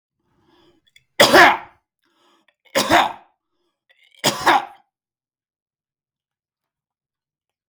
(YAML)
three_cough_length: 7.7 s
three_cough_amplitude: 32768
three_cough_signal_mean_std_ratio: 0.27
survey_phase: beta (2021-08-13 to 2022-03-07)
age: 45-64
gender: Male
wearing_mask: 'No'
symptom_none: true
smoker_status: Never smoked
respiratory_condition_asthma: false
respiratory_condition_other: false
recruitment_source: REACT
submission_delay: 4 days
covid_test_result: Negative
covid_test_method: RT-qPCR
influenza_a_test_result: Negative
influenza_b_test_result: Negative